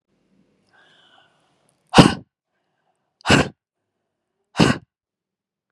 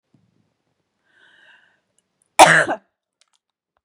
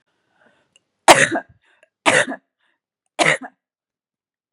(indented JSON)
{
  "exhalation_length": "5.7 s",
  "exhalation_amplitude": 32768,
  "exhalation_signal_mean_std_ratio": 0.22,
  "cough_length": "3.8 s",
  "cough_amplitude": 32768,
  "cough_signal_mean_std_ratio": 0.21,
  "three_cough_length": "4.5 s",
  "three_cough_amplitude": 32768,
  "three_cough_signal_mean_std_ratio": 0.27,
  "survey_phase": "beta (2021-08-13 to 2022-03-07)",
  "age": "18-44",
  "gender": "Female",
  "wearing_mask": "No",
  "symptom_none": true,
  "symptom_onset": "2 days",
  "smoker_status": "Never smoked",
  "respiratory_condition_asthma": false,
  "respiratory_condition_other": false,
  "recruitment_source": "REACT",
  "submission_delay": "5 days",
  "covid_test_result": "Negative",
  "covid_test_method": "RT-qPCR",
  "influenza_a_test_result": "Negative",
  "influenza_b_test_result": "Negative"
}